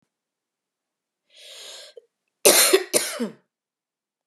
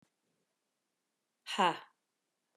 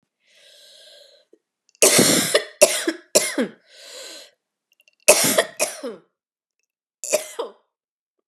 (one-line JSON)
{"cough_length": "4.3 s", "cough_amplitude": 32518, "cough_signal_mean_std_ratio": 0.29, "exhalation_length": "2.6 s", "exhalation_amplitude": 5712, "exhalation_signal_mean_std_ratio": 0.22, "three_cough_length": "8.3 s", "three_cough_amplitude": 32768, "three_cough_signal_mean_std_ratio": 0.35, "survey_phase": "beta (2021-08-13 to 2022-03-07)", "age": "45-64", "gender": "Female", "wearing_mask": "No", "symptom_cough_any": true, "symptom_runny_or_blocked_nose": true, "symptom_sore_throat": true, "symptom_headache": true, "smoker_status": "Never smoked", "respiratory_condition_asthma": false, "respiratory_condition_other": false, "recruitment_source": "Test and Trace", "submission_delay": "2 days", "covid_test_result": "Positive", "covid_test_method": "LFT"}